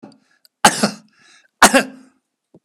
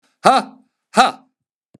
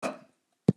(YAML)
three_cough_length: 2.6 s
three_cough_amplitude: 32768
three_cough_signal_mean_std_ratio: 0.28
exhalation_length: 1.8 s
exhalation_amplitude: 32768
exhalation_signal_mean_std_ratio: 0.33
cough_length: 0.8 s
cough_amplitude: 15709
cough_signal_mean_std_ratio: 0.23
survey_phase: beta (2021-08-13 to 2022-03-07)
age: 65+
gender: Male
wearing_mask: 'No'
symptom_none: true
smoker_status: Never smoked
respiratory_condition_asthma: false
respiratory_condition_other: false
recruitment_source: REACT
submission_delay: 1 day
covid_test_result: Negative
covid_test_method: RT-qPCR